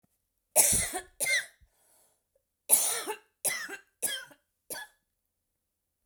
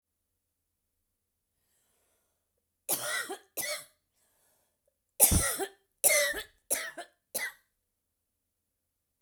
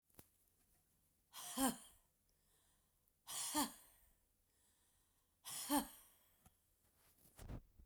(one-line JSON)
{"three_cough_length": "6.1 s", "three_cough_amplitude": 18985, "three_cough_signal_mean_std_ratio": 0.37, "cough_length": "9.2 s", "cough_amplitude": 18330, "cough_signal_mean_std_ratio": 0.3, "exhalation_length": "7.9 s", "exhalation_amplitude": 2141, "exhalation_signal_mean_std_ratio": 0.32, "survey_phase": "beta (2021-08-13 to 2022-03-07)", "age": "45-64", "gender": "Female", "wearing_mask": "No", "symptom_new_continuous_cough": true, "symptom_runny_or_blocked_nose": true, "symptom_sore_throat": true, "symptom_onset": "8 days", "smoker_status": "Never smoked", "respiratory_condition_asthma": true, "respiratory_condition_other": false, "recruitment_source": "REACT", "submission_delay": "1 day", "covid_test_result": "Negative", "covid_test_method": "RT-qPCR"}